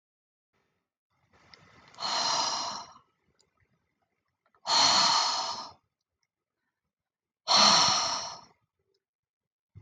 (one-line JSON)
{"exhalation_length": "9.8 s", "exhalation_amplitude": 15117, "exhalation_signal_mean_std_ratio": 0.39, "survey_phase": "beta (2021-08-13 to 2022-03-07)", "age": "45-64", "gender": "Female", "wearing_mask": "No", "symptom_none": true, "smoker_status": "Never smoked", "respiratory_condition_asthma": false, "respiratory_condition_other": false, "recruitment_source": "REACT", "submission_delay": "2 days", "covid_test_result": "Negative", "covid_test_method": "RT-qPCR"}